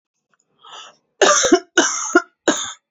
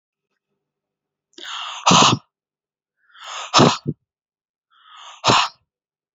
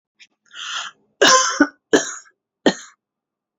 cough_length: 2.9 s
cough_amplitude: 30519
cough_signal_mean_std_ratio: 0.43
exhalation_length: 6.1 s
exhalation_amplitude: 30590
exhalation_signal_mean_std_ratio: 0.32
three_cough_length: 3.6 s
three_cough_amplitude: 31761
three_cough_signal_mean_std_ratio: 0.35
survey_phase: beta (2021-08-13 to 2022-03-07)
age: 18-44
gender: Female
wearing_mask: 'No'
symptom_none: true
smoker_status: Ex-smoker
respiratory_condition_asthma: false
respiratory_condition_other: false
recruitment_source: REACT
submission_delay: 1 day
covid_test_result: Negative
covid_test_method: RT-qPCR
influenza_a_test_result: Negative
influenza_b_test_result: Negative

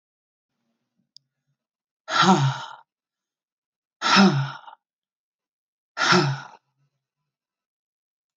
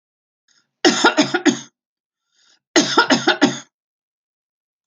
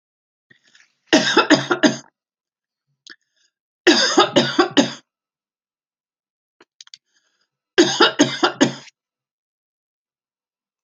exhalation_length: 8.4 s
exhalation_amplitude: 21708
exhalation_signal_mean_std_ratio: 0.32
cough_length: 4.9 s
cough_amplitude: 31698
cough_signal_mean_std_ratio: 0.38
three_cough_length: 10.8 s
three_cough_amplitude: 31319
three_cough_signal_mean_std_ratio: 0.33
survey_phase: alpha (2021-03-01 to 2021-08-12)
age: 45-64
gender: Female
wearing_mask: 'No'
symptom_none: true
smoker_status: Never smoked
respiratory_condition_asthma: false
respiratory_condition_other: false
recruitment_source: REACT
submission_delay: 2 days
covid_test_result: Negative
covid_test_method: RT-qPCR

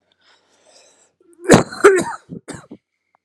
three_cough_length: 3.2 s
three_cough_amplitude: 32768
three_cough_signal_mean_std_ratio: 0.29
survey_phase: alpha (2021-03-01 to 2021-08-12)
age: 18-44
gender: Male
wearing_mask: 'No'
symptom_cough_any: true
symptom_fatigue: true
symptom_fever_high_temperature: true
symptom_headache: true
symptom_change_to_sense_of_smell_or_taste: true
symptom_loss_of_taste: true
symptom_onset: 6 days
smoker_status: Ex-smoker
respiratory_condition_asthma: false
respiratory_condition_other: false
recruitment_source: Test and Trace
submission_delay: 2 days
covid_test_result: Positive
covid_test_method: RT-qPCR
covid_ct_value: 24.6
covid_ct_gene: ORF1ab gene
covid_ct_mean: 24.9
covid_viral_load: 6900 copies/ml
covid_viral_load_category: Minimal viral load (< 10K copies/ml)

